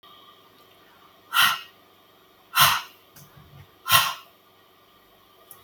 exhalation_length: 5.6 s
exhalation_amplitude: 30342
exhalation_signal_mean_std_ratio: 0.31
survey_phase: beta (2021-08-13 to 2022-03-07)
age: 45-64
gender: Female
wearing_mask: 'No'
symptom_none: true
smoker_status: Never smoked
respiratory_condition_asthma: false
respiratory_condition_other: false
recruitment_source: REACT
submission_delay: 1 day
covid_test_result: Negative
covid_test_method: RT-qPCR
influenza_a_test_result: Negative
influenza_b_test_result: Negative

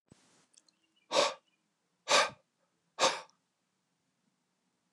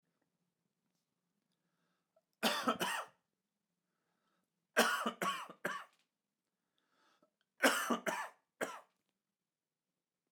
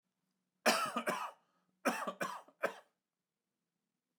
exhalation_length: 4.9 s
exhalation_amplitude: 7232
exhalation_signal_mean_std_ratio: 0.27
three_cough_length: 10.3 s
three_cough_amplitude: 6695
three_cough_signal_mean_std_ratio: 0.32
cough_length: 4.2 s
cough_amplitude: 4838
cough_signal_mean_std_ratio: 0.37
survey_phase: alpha (2021-03-01 to 2021-08-12)
age: 45-64
gender: Male
wearing_mask: 'No'
symptom_none: true
smoker_status: Never smoked
respiratory_condition_asthma: false
respiratory_condition_other: false
recruitment_source: REACT
submission_delay: 1 day
covid_test_result: Negative
covid_test_method: RT-qPCR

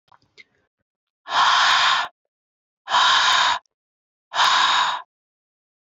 exhalation_length: 6.0 s
exhalation_amplitude: 19471
exhalation_signal_mean_std_ratio: 0.52
survey_phase: beta (2021-08-13 to 2022-03-07)
age: 18-44
gender: Female
wearing_mask: 'No'
symptom_cough_any: true
symptom_runny_or_blocked_nose: true
symptom_sore_throat: true
symptom_fatigue: true
symptom_headache: true
symptom_change_to_sense_of_smell_or_taste: true
symptom_loss_of_taste: true
symptom_onset: 12 days
smoker_status: Never smoked
respiratory_condition_asthma: false
respiratory_condition_other: false
recruitment_source: REACT
submission_delay: 2 days
covid_test_result: Negative
covid_test_method: RT-qPCR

